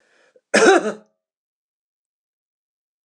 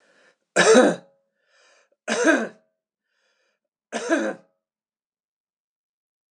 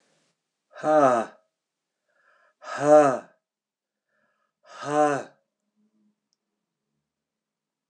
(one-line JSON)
{"cough_length": "3.1 s", "cough_amplitude": 26028, "cough_signal_mean_std_ratio": 0.27, "three_cough_length": "6.3 s", "three_cough_amplitude": 25708, "three_cough_signal_mean_std_ratio": 0.31, "exhalation_length": "7.9 s", "exhalation_amplitude": 16588, "exhalation_signal_mean_std_ratio": 0.3, "survey_phase": "alpha (2021-03-01 to 2021-08-12)", "age": "45-64", "gender": "Male", "wearing_mask": "No", "symptom_none": true, "smoker_status": "Never smoked", "respiratory_condition_asthma": false, "respiratory_condition_other": false, "recruitment_source": "REACT", "submission_delay": "1 day", "covid_test_result": "Negative", "covid_test_method": "RT-qPCR"}